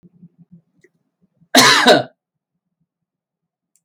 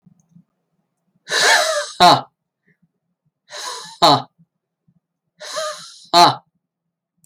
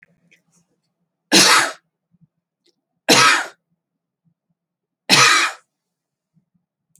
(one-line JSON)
{"cough_length": "3.8 s", "cough_amplitude": 31830, "cough_signal_mean_std_ratio": 0.29, "exhalation_length": "7.3 s", "exhalation_amplitude": 31443, "exhalation_signal_mean_std_ratio": 0.34, "three_cough_length": "7.0 s", "three_cough_amplitude": 32768, "three_cough_signal_mean_std_ratio": 0.32, "survey_phase": "beta (2021-08-13 to 2022-03-07)", "age": "45-64", "gender": "Male", "wearing_mask": "No", "symptom_none": true, "smoker_status": "Ex-smoker", "respiratory_condition_asthma": false, "respiratory_condition_other": false, "recruitment_source": "REACT", "submission_delay": "11 days", "covid_test_result": "Negative", "covid_test_method": "RT-qPCR"}